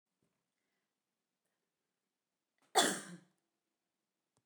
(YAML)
cough_length: 4.5 s
cough_amplitude: 5958
cough_signal_mean_std_ratio: 0.18
survey_phase: beta (2021-08-13 to 2022-03-07)
age: 45-64
gender: Female
wearing_mask: 'No'
symptom_runny_or_blocked_nose: true
symptom_fatigue: true
smoker_status: Never smoked
respiratory_condition_asthma: false
respiratory_condition_other: false
recruitment_source: Test and Trace
submission_delay: 1 day
covid_test_result: Negative
covid_test_method: RT-qPCR